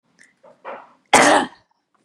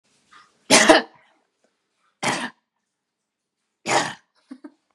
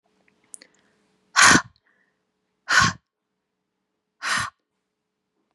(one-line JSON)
{"cough_length": "2.0 s", "cough_amplitude": 32768, "cough_signal_mean_std_ratio": 0.33, "three_cough_length": "4.9 s", "three_cough_amplitude": 32767, "three_cough_signal_mean_std_ratio": 0.28, "exhalation_length": "5.5 s", "exhalation_amplitude": 28639, "exhalation_signal_mean_std_ratio": 0.26, "survey_phase": "beta (2021-08-13 to 2022-03-07)", "age": "18-44", "gender": "Female", "wearing_mask": "No", "symptom_none": true, "smoker_status": "Never smoked", "respiratory_condition_asthma": false, "respiratory_condition_other": false, "recruitment_source": "REACT", "submission_delay": "1 day", "covid_test_result": "Negative", "covid_test_method": "RT-qPCR", "influenza_a_test_result": "Negative", "influenza_b_test_result": "Negative"}